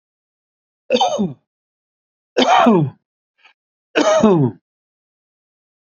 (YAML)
three_cough_length: 5.8 s
three_cough_amplitude: 28112
three_cough_signal_mean_std_ratio: 0.42
survey_phase: beta (2021-08-13 to 2022-03-07)
age: 65+
gender: Male
wearing_mask: 'No'
symptom_none: true
smoker_status: Ex-smoker
respiratory_condition_asthma: false
respiratory_condition_other: false
recruitment_source: REACT
submission_delay: 1 day
covid_test_result: Negative
covid_test_method: RT-qPCR
influenza_a_test_result: Negative
influenza_b_test_result: Negative